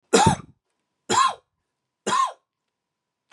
{
  "three_cough_length": "3.3 s",
  "three_cough_amplitude": 24510,
  "three_cough_signal_mean_std_ratio": 0.37,
  "survey_phase": "beta (2021-08-13 to 2022-03-07)",
  "age": "45-64",
  "gender": "Male",
  "wearing_mask": "No",
  "symptom_cough_any": true,
  "symptom_new_continuous_cough": true,
  "symptom_runny_or_blocked_nose": true,
  "symptom_shortness_of_breath": true,
  "symptom_fever_high_temperature": true,
  "symptom_headache": true,
  "symptom_change_to_sense_of_smell_or_taste": true,
  "smoker_status": "Never smoked",
  "respiratory_condition_asthma": false,
  "respiratory_condition_other": false,
  "recruitment_source": "Test and Trace",
  "submission_delay": "2 days",
  "covid_test_result": "Positive",
  "covid_test_method": "RT-qPCR"
}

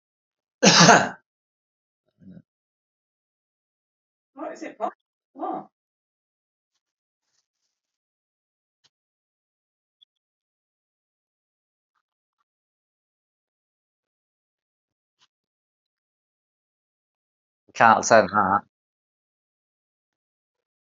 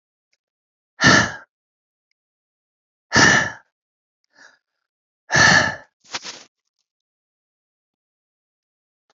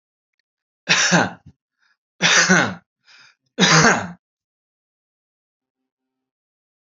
{
  "cough_length": "20.9 s",
  "cough_amplitude": 32767,
  "cough_signal_mean_std_ratio": 0.18,
  "exhalation_length": "9.1 s",
  "exhalation_amplitude": 29798,
  "exhalation_signal_mean_std_ratio": 0.27,
  "three_cough_length": "6.8 s",
  "three_cough_amplitude": 30518,
  "three_cough_signal_mean_std_ratio": 0.35,
  "survey_phase": "alpha (2021-03-01 to 2021-08-12)",
  "age": "45-64",
  "gender": "Male",
  "wearing_mask": "No",
  "symptom_none": true,
  "smoker_status": "Never smoked",
  "respiratory_condition_asthma": false,
  "respiratory_condition_other": false,
  "recruitment_source": "REACT",
  "submission_delay": "1 day",
  "covid_test_result": "Negative",
  "covid_test_method": "RT-qPCR"
}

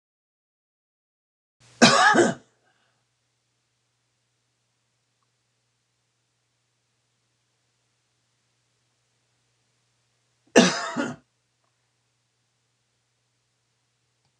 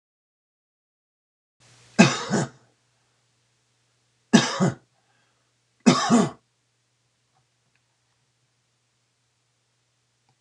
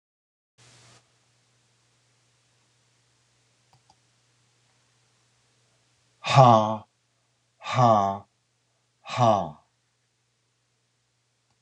{
  "cough_length": "14.4 s",
  "cough_amplitude": 26028,
  "cough_signal_mean_std_ratio": 0.19,
  "three_cough_length": "10.4 s",
  "three_cough_amplitude": 25945,
  "three_cough_signal_mean_std_ratio": 0.24,
  "exhalation_length": "11.6 s",
  "exhalation_amplitude": 25606,
  "exhalation_signal_mean_std_ratio": 0.24,
  "survey_phase": "beta (2021-08-13 to 2022-03-07)",
  "age": "65+",
  "gender": "Male",
  "wearing_mask": "No",
  "symptom_cough_any": true,
  "symptom_runny_or_blocked_nose": true,
  "symptom_shortness_of_breath": true,
  "smoker_status": "Ex-smoker",
  "respiratory_condition_asthma": false,
  "respiratory_condition_other": true,
  "recruitment_source": "REACT",
  "submission_delay": "1 day",
  "covid_test_result": "Negative",
  "covid_test_method": "RT-qPCR",
  "influenza_a_test_result": "Negative",
  "influenza_b_test_result": "Negative"
}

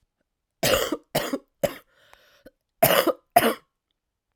{
  "cough_length": "4.4 s",
  "cough_amplitude": 27499,
  "cough_signal_mean_std_ratio": 0.36,
  "survey_phase": "alpha (2021-03-01 to 2021-08-12)",
  "age": "18-44",
  "gender": "Female",
  "wearing_mask": "No",
  "symptom_cough_any": true,
  "symptom_new_continuous_cough": true,
  "symptom_shortness_of_breath": true,
  "symptom_fatigue": true,
  "symptom_fever_high_temperature": true,
  "symptom_headache": true,
  "symptom_change_to_sense_of_smell_or_taste": true,
  "symptom_loss_of_taste": true,
  "symptom_onset": "5 days",
  "smoker_status": "Never smoked",
  "respiratory_condition_asthma": false,
  "respiratory_condition_other": false,
  "recruitment_source": "Test and Trace",
  "submission_delay": "2 days",
  "covid_test_result": "Positive",
  "covid_test_method": "RT-qPCR",
  "covid_ct_value": 10.9,
  "covid_ct_gene": "N gene",
  "covid_ct_mean": 11.5,
  "covid_viral_load": "170000000 copies/ml",
  "covid_viral_load_category": "High viral load (>1M copies/ml)"
}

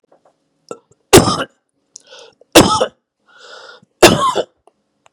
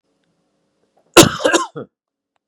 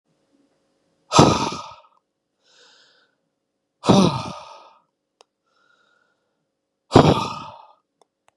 {
  "three_cough_length": "5.1 s",
  "three_cough_amplitude": 32768,
  "three_cough_signal_mean_std_ratio": 0.32,
  "cough_length": "2.5 s",
  "cough_amplitude": 32768,
  "cough_signal_mean_std_ratio": 0.27,
  "exhalation_length": "8.4 s",
  "exhalation_amplitude": 32768,
  "exhalation_signal_mean_std_ratio": 0.27,
  "survey_phase": "beta (2021-08-13 to 2022-03-07)",
  "age": "45-64",
  "gender": "Male",
  "wearing_mask": "No",
  "symptom_cough_any": true,
  "symptom_runny_or_blocked_nose": true,
  "symptom_onset": "5 days",
  "smoker_status": "Ex-smoker",
  "respiratory_condition_asthma": false,
  "respiratory_condition_other": false,
  "recruitment_source": "Test and Trace",
  "submission_delay": "2 days",
  "covid_test_result": "Positive",
  "covid_test_method": "RT-qPCR",
  "covid_ct_value": 24.1,
  "covid_ct_gene": "N gene"
}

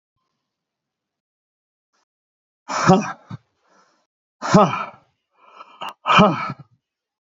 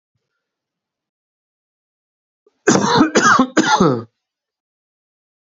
{
  "exhalation_length": "7.3 s",
  "exhalation_amplitude": 28043,
  "exhalation_signal_mean_std_ratio": 0.29,
  "cough_length": "5.5 s",
  "cough_amplitude": 29098,
  "cough_signal_mean_std_ratio": 0.37,
  "survey_phase": "beta (2021-08-13 to 2022-03-07)",
  "age": "65+",
  "gender": "Male",
  "wearing_mask": "No",
  "symptom_none": true,
  "smoker_status": "Never smoked",
  "respiratory_condition_asthma": false,
  "respiratory_condition_other": false,
  "recruitment_source": "REACT",
  "submission_delay": "1 day",
  "covid_test_result": "Negative",
  "covid_test_method": "RT-qPCR"
}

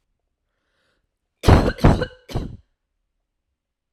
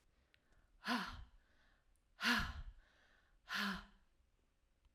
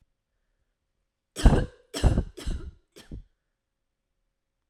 {
  "cough_length": "3.9 s",
  "cough_amplitude": 32768,
  "cough_signal_mean_std_ratio": 0.28,
  "exhalation_length": "4.9 s",
  "exhalation_amplitude": 2477,
  "exhalation_signal_mean_std_ratio": 0.39,
  "three_cough_length": "4.7 s",
  "three_cough_amplitude": 24755,
  "three_cough_signal_mean_std_ratio": 0.26,
  "survey_phase": "alpha (2021-03-01 to 2021-08-12)",
  "age": "18-44",
  "gender": "Female",
  "wearing_mask": "No",
  "symptom_none": true,
  "smoker_status": "Never smoked",
  "respiratory_condition_asthma": false,
  "respiratory_condition_other": false,
  "recruitment_source": "REACT",
  "submission_delay": "1 day",
  "covid_test_result": "Negative",
  "covid_test_method": "RT-qPCR"
}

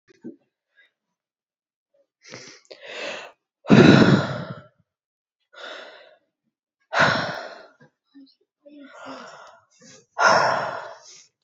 {
  "exhalation_length": "11.4 s",
  "exhalation_amplitude": 30857,
  "exhalation_signal_mean_std_ratio": 0.31,
  "survey_phase": "beta (2021-08-13 to 2022-03-07)",
  "age": "18-44",
  "gender": "Female",
  "wearing_mask": "Yes",
  "symptom_runny_or_blocked_nose": true,
  "symptom_fatigue": true,
  "symptom_headache": true,
  "symptom_change_to_sense_of_smell_or_taste": true,
  "symptom_loss_of_taste": true,
  "symptom_onset": "10 days",
  "smoker_status": "Ex-smoker",
  "respiratory_condition_asthma": false,
  "respiratory_condition_other": false,
  "recruitment_source": "Test and Trace",
  "submission_delay": "2 days",
  "covid_test_result": "Positive",
  "covid_test_method": "ePCR"
}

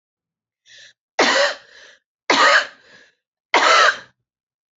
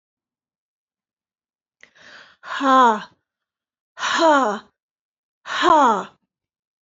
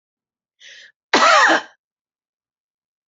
{
  "three_cough_length": "4.8 s",
  "three_cough_amplitude": 28558,
  "three_cough_signal_mean_std_ratio": 0.41,
  "exhalation_length": "6.8 s",
  "exhalation_amplitude": 24502,
  "exhalation_signal_mean_std_ratio": 0.37,
  "cough_length": "3.1 s",
  "cough_amplitude": 28233,
  "cough_signal_mean_std_ratio": 0.33,
  "survey_phase": "alpha (2021-03-01 to 2021-08-12)",
  "age": "65+",
  "gender": "Female",
  "wearing_mask": "No",
  "symptom_none": true,
  "smoker_status": "Ex-smoker",
  "respiratory_condition_asthma": false,
  "respiratory_condition_other": false,
  "recruitment_source": "REACT",
  "submission_delay": "2 days",
  "covid_test_result": "Negative",
  "covid_test_method": "RT-qPCR"
}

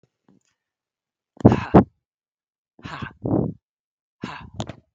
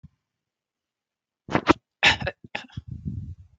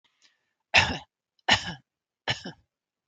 {
  "exhalation_length": "4.9 s",
  "exhalation_amplitude": 32768,
  "exhalation_signal_mean_std_ratio": 0.24,
  "cough_length": "3.6 s",
  "cough_amplitude": 29594,
  "cough_signal_mean_std_ratio": 0.28,
  "three_cough_length": "3.1 s",
  "three_cough_amplitude": 27368,
  "three_cough_signal_mean_std_ratio": 0.28,
  "survey_phase": "beta (2021-08-13 to 2022-03-07)",
  "age": "65+",
  "gender": "Female",
  "wearing_mask": "No",
  "symptom_none": true,
  "smoker_status": "Never smoked",
  "respiratory_condition_asthma": false,
  "respiratory_condition_other": false,
  "recruitment_source": "REACT",
  "submission_delay": "1 day",
  "covid_test_result": "Negative",
  "covid_test_method": "RT-qPCR",
  "influenza_a_test_result": "Unknown/Void",
  "influenza_b_test_result": "Unknown/Void"
}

